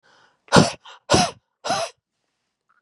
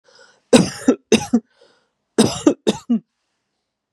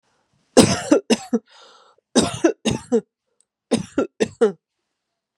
{
  "exhalation_length": "2.8 s",
  "exhalation_amplitude": 32768,
  "exhalation_signal_mean_std_ratio": 0.33,
  "cough_length": "3.9 s",
  "cough_amplitude": 32768,
  "cough_signal_mean_std_ratio": 0.35,
  "three_cough_length": "5.4 s",
  "three_cough_amplitude": 32768,
  "three_cough_signal_mean_std_ratio": 0.37,
  "survey_phase": "beta (2021-08-13 to 2022-03-07)",
  "age": "18-44",
  "gender": "Female",
  "wearing_mask": "No",
  "symptom_sore_throat": true,
  "symptom_abdominal_pain": true,
  "symptom_fatigue": true,
  "symptom_onset": "8 days",
  "smoker_status": "Ex-smoker",
  "respiratory_condition_asthma": false,
  "respiratory_condition_other": false,
  "recruitment_source": "REACT",
  "submission_delay": "1 day",
  "covid_test_result": "Negative",
  "covid_test_method": "RT-qPCR",
  "influenza_a_test_result": "Negative",
  "influenza_b_test_result": "Negative"
}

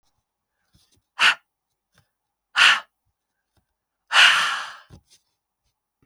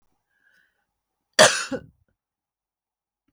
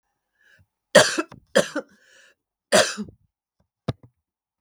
{
  "exhalation_length": "6.1 s",
  "exhalation_amplitude": 27579,
  "exhalation_signal_mean_std_ratio": 0.29,
  "cough_length": "3.3 s",
  "cough_amplitude": 32767,
  "cough_signal_mean_std_ratio": 0.19,
  "three_cough_length": "4.6 s",
  "three_cough_amplitude": 32768,
  "three_cough_signal_mean_std_ratio": 0.26,
  "survey_phase": "beta (2021-08-13 to 2022-03-07)",
  "age": "65+",
  "gender": "Female",
  "wearing_mask": "No",
  "symptom_none": true,
  "smoker_status": "Never smoked",
  "respiratory_condition_asthma": false,
  "respiratory_condition_other": false,
  "recruitment_source": "REACT",
  "submission_delay": "5 days",
  "covid_test_result": "Negative",
  "covid_test_method": "RT-qPCR",
  "influenza_a_test_result": "Negative",
  "influenza_b_test_result": "Negative"
}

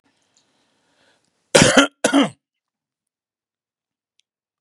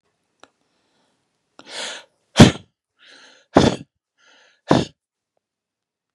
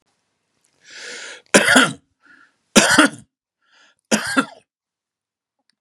{
  "cough_length": "4.6 s",
  "cough_amplitude": 32768,
  "cough_signal_mean_std_ratio": 0.25,
  "exhalation_length": "6.1 s",
  "exhalation_amplitude": 32768,
  "exhalation_signal_mean_std_ratio": 0.2,
  "three_cough_length": "5.8 s",
  "three_cough_amplitude": 32768,
  "three_cough_signal_mean_std_ratio": 0.32,
  "survey_phase": "beta (2021-08-13 to 2022-03-07)",
  "age": "65+",
  "gender": "Male",
  "wearing_mask": "No",
  "symptom_none": true,
  "smoker_status": "Ex-smoker",
  "respiratory_condition_asthma": false,
  "respiratory_condition_other": false,
  "recruitment_source": "REACT",
  "submission_delay": "2 days",
  "covid_test_result": "Negative",
  "covid_test_method": "RT-qPCR",
  "influenza_a_test_result": "Negative",
  "influenza_b_test_result": "Negative"
}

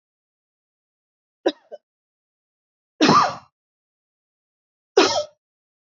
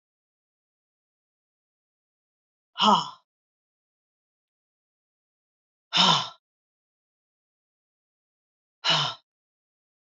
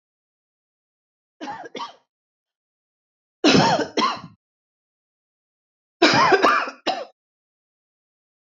{
  "three_cough_length": "6.0 s",
  "three_cough_amplitude": 25401,
  "three_cough_signal_mean_std_ratio": 0.25,
  "exhalation_length": "10.1 s",
  "exhalation_amplitude": 14748,
  "exhalation_signal_mean_std_ratio": 0.22,
  "cough_length": "8.4 s",
  "cough_amplitude": 31750,
  "cough_signal_mean_std_ratio": 0.34,
  "survey_phase": "beta (2021-08-13 to 2022-03-07)",
  "age": "45-64",
  "gender": "Female",
  "wearing_mask": "No",
  "symptom_cough_any": true,
  "symptom_fatigue": true,
  "symptom_change_to_sense_of_smell_or_taste": true,
  "smoker_status": "Ex-smoker",
  "respiratory_condition_asthma": false,
  "respiratory_condition_other": false,
  "recruitment_source": "REACT",
  "submission_delay": "1 day",
  "covid_test_result": "Negative",
  "covid_test_method": "RT-qPCR",
  "influenza_a_test_result": "Unknown/Void",
  "influenza_b_test_result": "Unknown/Void"
}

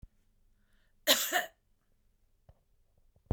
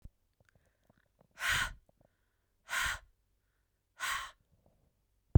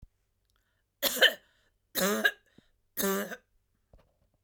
{
  "cough_length": "3.3 s",
  "cough_amplitude": 10087,
  "cough_signal_mean_std_ratio": 0.26,
  "exhalation_length": "5.4 s",
  "exhalation_amplitude": 10923,
  "exhalation_signal_mean_std_ratio": 0.25,
  "three_cough_length": "4.4 s",
  "three_cough_amplitude": 12446,
  "three_cough_signal_mean_std_ratio": 0.34,
  "survey_phase": "beta (2021-08-13 to 2022-03-07)",
  "age": "45-64",
  "gender": "Female",
  "wearing_mask": "No",
  "symptom_cough_any": true,
  "symptom_shortness_of_breath": true,
  "smoker_status": "Never smoked",
  "respiratory_condition_asthma": true,
  "respiratory_condition_other": false,
  "recruitment_source": "REACT",
  "submission_delay": "3 days",
  "covid_test_result": "Negative",
  "covid_test_method": "RT-qPCR"
}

